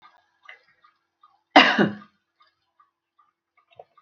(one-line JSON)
{"cough_length": "4.0 s", "cough_amplitude": 27719, "cough_signal_mean_std_ratio": 0.21, "survey_phase": "alpha (2021-03-01 to 2021-08-12)", "age": "65+", "gender": "Female", "wearing_mask": "No", "symptom_fatigue": true, "symptom_headache": true, "smoker_status": "Ex-smoker", "respiratory_condition_asthma": false, "respiratory_condition_other": false, "recruitment_source": "REACT", "submission_delay": "2 days", "covid_test_result": "Negative", "covid_test_method": "RT-qPCR"}